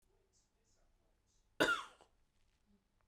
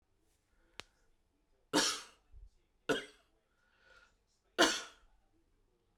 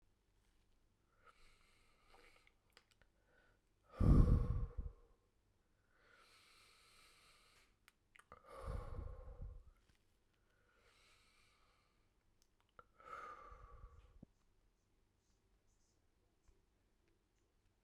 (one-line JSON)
{"cough_length": "3.1 s", "cough_amplitude": 4958, "cough_signal_mean_std_ratio": 0.22, "three_cough_length": "6.0 s", "three_cough_amplitude": 7646, "three_cough_signal_mean_std_ratio": 0.25, "exhalation_length": "17.8 s", "exhalation_amplitude": 4114, "exhalation_signal_mean_std_ratio": 0.22, "survey_phase": "beta (2021-08-13 to 2022-03-07)", "age": "45-64", "gender": "Female", "wearing_mask": "No", "symptom_cough_any": true, "symptom_runny_or_blocked_nose": true, "symptom_sore_throat": true, "symptom_fatigue": true, "symptom_fever_high_temperature": true, "symptom_headache": true, "symptom_change_to_sense_of_smell_or_taste": true, "symptom_loss_of_taste": true, "symptom_onset": "3 days", "smoker_status": "Never smoked", "respiratory_condition_asthma": false, "respiratory_condition_other": false, "recruitment_source": "Test and Trace", "submission_delay": "1 day", "covid_test_result": "Positive", "covid_test_method": "RT-qPCR", "covid_ct_value": 19.4, "covid_ct_gene": "ORF1ab gene", "covid_ct_mean": 20.1, "covid_viral_load": "250000 copies/ml", "covid_viral_load_category": "Low viral load (10K-1M copies/ml)"}